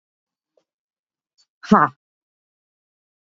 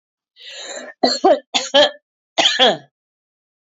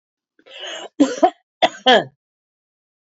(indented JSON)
{
  "exhalation_length": "3.3 s",
  "exhalation_amplitude": 28460,
  "exhalation_signal_mean_std_ratio": 0.17,
  "three_cough_length": "3.8 s",
  "three_cough_amplitude": 27426,
  "three_cough_signal_mean_std_ratio": 0.42,
  "cough_length": "3.2 s",
  "cough_amplitude": 28956,
  "cough_signal_mean_std_ratio": 0.32,
  "survey_phase": "beta (2021-08-13 to 2022-03-07)",
  "age": "45-64",
  "gender": "Female",
  "wearing_mask": "No",
  "symptom_cough_any": true,
  "symptom_runny_or_blocked_nose": true,
  "symptom_fatigue": true,
  "symptom_headache": true,
  "smoker_status": "Never smoked",
  "respiratory_condition_asthma": false,
  "respiratory_condition_other": false,
  "recruitment_source": "Test and Trace",
  "submission_delay": "1 day",
  "covid_test_result": "Positive",
  "covid_test_method": "RT-qPCR",
  "covid_ct_value": 16.9,
  "covid_ct_gene": "ORF1ab gene",
  "covid_ct_mean": 17.4,
  "covid_viral_load": "2000000 copies/ml",
  "covid_viral_load_category": "High viral load (>1M copies/ml)"
}